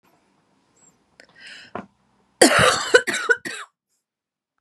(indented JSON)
{
  "cough_length": "4.6 s",
  "cough_amplitude": 32768,
  "cough_signal_mean_std_ratio": 0.31,
  "survey_phase": "beta (2021-08-13 to 2022-03-07)",
  "age": "18-44",
  "gender": "Female",
  "wearing_mask": "No",
  "symptom_none": true,
  "smoker_status": "Never smoked",
  "respiratory_condition_asthma": false,
  "respiratory_condition_other": false,
  "recruitment_source": "REACT",
  "submission_delay": "1 day",
  "covid_test_result": "Negative",
  "covid_test_method": "RT-qPCR"
}